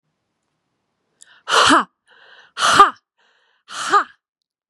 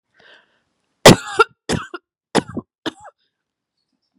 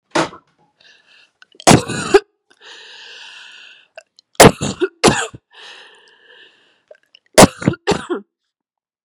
exhalation_length: 4.7 s
exhalation_amplitude: 32768
exhalation_signal_mean_std_ratio: 0.33
cough_length: 4.2 s
cough_amplitude: 32768
cough_signal_mean_std_ratio: 0.22
three_cough_length: 9.0 s
three_cough_amplitude: 32768
three_cough_signal_mean_std_ratio: 0.28
survey_phase: beta (2021-08-13 to 2022-03-07)
age: 18-44
gender: Female
wearing_mask: 'No'
symptom_shortness_of_breath: true
symptom_sore_throat: true
symptom_onset: 3 days
smoker_status: Never smoked
respiratory_condition_asthma: false
respiratory_condition_other: false
recruitment_source: Test and Trace
submission_delay: 2 days
covid_test_result: Positive
covid_test_method: RT-qPCR
covid_ct_value: 16.3
covid_ct_gene: ORF1ab gene
covid_ct_mean: 16.6
covid_viral_load: 3700000 copies/ml
covid_viral_load_category: High viral load (>1M copies/ml)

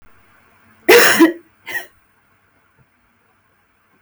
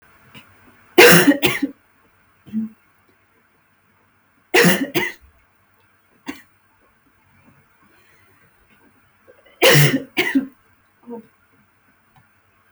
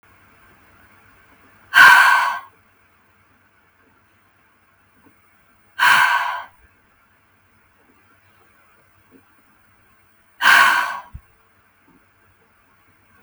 cough_length: 4.0 s
cough_amplitude: 32768
cough_signal_mean_std_ratio: 0.3
three_cough_length: 12.7 s
three_cough_amplitude: 32768
three_cough_signal_mean_std_ratio: 0.3
exhalation_length: 13.2 s
exhalation_amplitude: 32768
exhalation_signal_mean_std_ratio: 0.29
survey_phase: beta (2021-08-13 to 2022-03-07)
age: 18-44
gender: Female
wearing_mask: 'No'
symptom_cough_any: true
symptom_shortness_of_breath: true
symptom_onset: 12 days
smoker_status: Never smoked
respiratory_condition_asthma: true
respiratory_condition_other: false
recruitment_source: REACT
submission_delay: 2 days
covid_test_result: Negative
covid_test_method: RT-qPCR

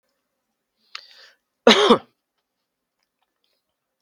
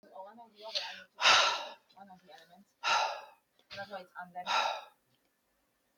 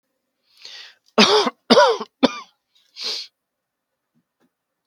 cough_length: 4.0 s
cough_amplitude: 32768
cough_signal_mean_std_ratio: 0.21
exhalation_length: 6.0 s
exhalation_amplitude: 9709
exhalation_signal_mean_std_ratio: 0.4
three_cough_length: 4.9 s
three_cough_amplitude: 32768
three_cough_signal_mean_std_ratio: 0.32
survey_phase: beta (2021-08-13 to 2022-03-07)
age: 45-64
gender: Male
wearing_mask: 'No'
symptom_change_to_sense_of_smell_or_taste: true
smoker_status: Never smoked
respiratory_condition_asthma: false
respiratory_condition_other: false
recruitment_source: REACT
submission_delay: 2 days
covid_test_result: Positive
covid_test_method: RT-qPCR
covid_ct_value: 36.8
covid_ct_gene: N gene
influenza_a_test_result: Negative
influenza_b_test_result: Negative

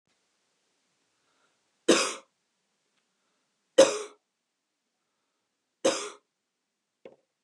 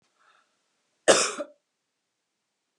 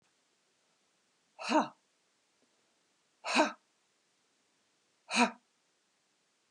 three_cough_length: 7.4 s
three_cough_amplitude: 18513
three_cough_signal_mean_std_ratio: 0.2
cough_length: 2.8 s
cough_amplitude: 21963
cough_signal_mean_std_ratio: 0.22
exhalation_length: 6.5 s
exhalation_amplitude: 7517
exhalation_signal_mean_std_ratio: 0.24
survey_phase: beta (2021-08-13 to 2022-03-07)
age: 65+
gender: Female
wearing_mask: 'No'
symptom_none: true
smoker_status: Never smoked
respiratory_condition_asthma: false
respiratory_condition_other: false
recruitment_source: REACT
submission_delay: 3 days
covid_test_result: Negative
covid_test_method: RT-qPCR
influenza_a_test_result: Negative
influenza_b_test_result: Negative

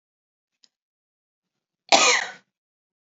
cough_length: 3.2 s
cough_amplitude: 30900
cough_signal_mean_std_ratio: 0.24
survey_phase: beta (2021-08-13 to 2022-03-07)
age: 45-64
gender: Female
wearing_mask: 'No'
symptom_none: true
smoker_status: Never smoked
respiratory_condition_asthma: false
respiratory_condition_other: false
recruitment_source: REACT
submission_delay: 1 day
covid_test_result: Negative
covid_test_method: RT-qPCR
influenza_a_test_result: Negative
influenza_b_test_result: Negative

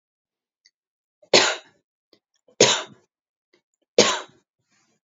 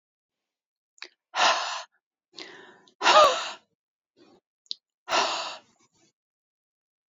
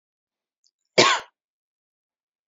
three_cough_length: 5.0 s
three_cough_amplitude: 31761
three_cough_signal_mean_std_ratio: 0.25
exhalation_length: 7.1 s
exhalation_amplitude: 19551
exhalation_signal_mean_std_ratio: 0.3
cough_length: 2.5 s
cough_amplitude: 28444
cough_signal_mean_std_ratio: 0.22
survey_phase: beta (2021-08-13 to 2022-03-07)
age: 45-64
gender: Female
wearing_mask: 'No'
symptom_sore_throat: true
smoker_status: Never smoked
respiratory_condition_asthma: false
respiratory_condition_other: false
recruitment_source: REACT
submission_delay: 2 days
covid_test_result: Negative
covid_test_method: RT-qPCR
influenza_a_test_result: Unknown/Void
influenza_b_test_result: Unknown/Void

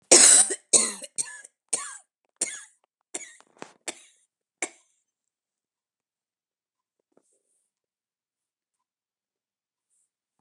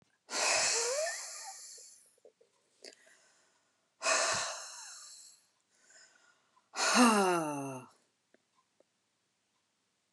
cough_length: 10.4 s
cough_amplitude: 31829
cough_signal_mean_std_ratio: 0.21
exhalation_length: 10.1 s
exhalation_amplitude: 8482
exhalation_signal_mean_std_ratio: 0.41
survey_phase: beta (2021-08-13 to 2022-03-07)
age: 45-64
gender: Female
wearing_mask: 'No'
symptom_cough_any: true
symptom_new_continuous_cough: true
symptom_runny_or_blocked_nose: true
symptom_sore_throat: true
symptom_onset: 2 days
smoker_status: Ex-smoker
respiratory_condition_asthma: false
respiratory_condition_other: false
recruitment_source: Test and Trace
submission_delay: 1 day
covid_test_result: Negative
covid_test_method: RT-qPCR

